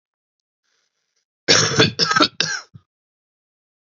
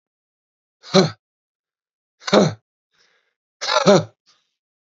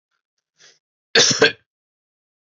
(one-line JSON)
{"three_cough_length": "3.8 s", "three_cough_amplitude": 32767, "three_cough_signal_mean_std_ratio": 0.35, "exhalation_length": "4.9 s", "exhalation_amplitude": 29635, "exhalation_signal_mean_std_ratio": 0.28, "cough_length": "2.6 s", "cough_amplitude": 31943, "cough_signal_mean_std_ratio": 0.28, "survey_phase": "beta (2021-08-13 to 2022-03-07)", "age": "18-44", "gender": "Male", "wearing_mask": "No", "symptom_cough_any": true, "symptom_fatigue": true, "symptom_headache": true, "symptom_onset": "6 days", "smoker_status": "Never smoked", "respiratory_condition_asthma": false, "respiratory_condition_other": false, "recruitment_source": "Test and Trace", "submission_delay": "1 day", "covid_test_result": "Positive", "covid_test_method": "RT-qPCR", "covid_ct_value": 18.8, "covid_ct_gene": "ORF1ab gene"}